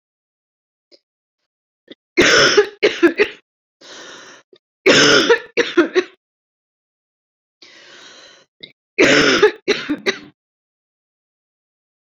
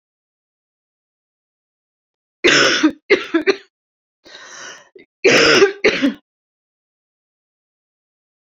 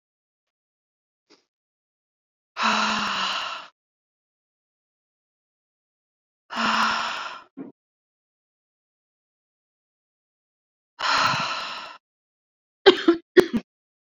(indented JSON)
{
  "three_cough_length": "12.0 s",
  "three_cough_amplitude": 32767,
  "three_cough_signal_mean_std_ratio": 0.37,
  "cough_length": "8.5 s",
  "cough_amplitude": 32767,
  "cough_signal_mean_std_ratio": 0.34,
  "exhalation_length": "14.1 s",
  "exhalation_amplitude": 32214,
  "exhalation_signal_mean_std_ratio": 0.31,
  "survey_phase": "alpha (2021-03-01 to 2021-08-12)",
  "age": "18-44",
  "gender": "Female",
  "wearing_mask": "No",
  "symptom_cough_any": true,
  "symptom_headache": true,
  "symptom_onset": "6 days",
  "smoker_status": "Never smoked",
  "respiratory_condition_asthma": false,
  "respiratory_condition_other": false,
  "recruitment_source": "Test and Trace",
  "submission_delay": "2 days",
  "covid_test_result": "Positive",
  "covid_test_method": "RT-qPCR"
}